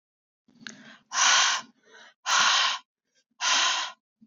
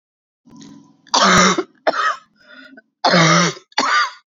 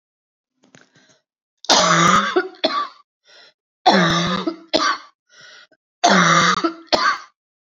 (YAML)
exhalation_length: 4.3 s
exhalation_amplitude: 12445
exhalation_signal_mean_std_ratio: 0.51
cough_length: 4.3 s
cough_amplitude: 29540
cough_signal_mean_std_ratio: 0.52
three_cough_length: 7.7 s
three_cough_amplitude: 30987
three_cough_signal_mean_std_ratio: 0.5
survey_phase: beta (2021-08-13 to 2022-03-07)
age: 45-64
gender: Female
wearing_mask: 'No'
symptom_cough_any: true
symptom_runny_or_blocked_nose: true
symptom_sore_throat: true
symptom_fatigue: true
symptom_fever_high_temperature: true
symptom_headache: true
symptom_change_to_sense_of_smell_or_taste: true
symptom_loss_of_taste: true
smoker_status: Never smoked
respiratory_condition_asthma: false
respiratory_condition_other: false
recruitment_source: Test and Trace
submission_delay: 2 days
covid_test_result: Positive
covid_test_method: RT-qPCR
covid_ct_value: 17.1
covid_ct_gene: ORF1ab gene